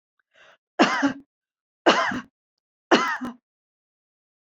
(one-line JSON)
{"three_cough_length": "4.4 s", "three_cough_amplitude": 27138, "three_cough_signal_mean_std_ratio": 0.34, "survey_phase": "beta (2021-08-13 to 2022-03-07)", "age": "45-64", "gender": "Female", "wearing_mask": "No", "symptom_none": true, "smoker_status": "Never smoked", "respiratory_condition_asthma": false, "respiratory_condition_other": false, "recruitment_source": "REACT", "submission_delay": "1 day", "covid_test_result": "Negative", "covid_test_method": "RT-qPCR"}